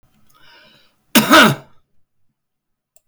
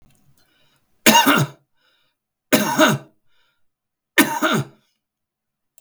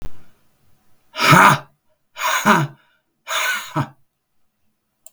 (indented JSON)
{
  "cough_length": "3.1 s",
  "cough_amplitude": 32768,
  "cough_signal_mean_std_ratio": 0.29,
  "three_cough_length": "5.8 s",
  "three_cough_amplitude": 32768,
  "three_cough_signal_mean_std_ratio": 0.36,
  "exhalation_length": "5.1 s",
  "exhalation_amplitude": 32768,
  "exhalation_signal_mean_std_ratio": 0.4,
  "survey_phase": "beta (2021-08-13 to 2022-03-07)",
  "age": "65+",
  "gender": "Male",
  "wearing_mask": "No",
  "symptom_none": true,
  "smoker_status": "Never smoked",
  "respiratory_condition_asthma": false,
  "respiratory_condition_other": false,
  "recruitment_source": "REACT",
  "submission_delay": "1 day",
  "covid_test_result": "Negative",
  "covid_test_method": "RT-qPCR",
  "influenza_a_test_result": "Negative",
  "influenza_b_test_result": "Negative"
}